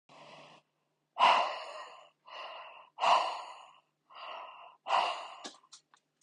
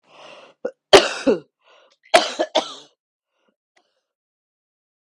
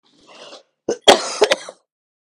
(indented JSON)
{
  "exhalation_length": "6.2 s",
  "exhalation_amplitude": 8188,
  "exhalation_signal_mean_std_ratio": 0.39,
  "three_cough_length": "5.1 s",
  "three_cough_amplitude": 32768,
  "three_cough_signal_mean_std_ratio": 0.24,
  "cough_length": "2.4 s",
  "cough_amplitude": 32768,
  "cough_signal_mean_std_ratio": 0.29,
  "survey_phase": "beta (2021-08-13 to 2022-03-07)",
  "age": "18-44",
  "gender": "Female",
  "wearing_mask": "No",
  "symptom_runny_or_blocked_nose": true,
  "symptom_sore_throat": true,
  "symptom_headache": true,
  "symptom_onset": "3 days",
  "smoker_status": "Current smoker (11 or more cigarettes per day)",
  "respiratory_condition_asthma": false,
  "respiratory_condition_other": false,
  "recruitment_source": "Test and Trace",
  "submission_delay": "1 day",
  "covid_test_result": "Positive",
  "covid_test_method": "RT-qPCR",
  "covid_ct_value": 20.0,
  "covid_ct_gene": "N gene",
  "covid_ct_mean": 20.1,
  "covid_viral_load": "260000 copies/ml",
  "covid_viral_load_category": "Low viral load (10K-1M copies/ml)"
}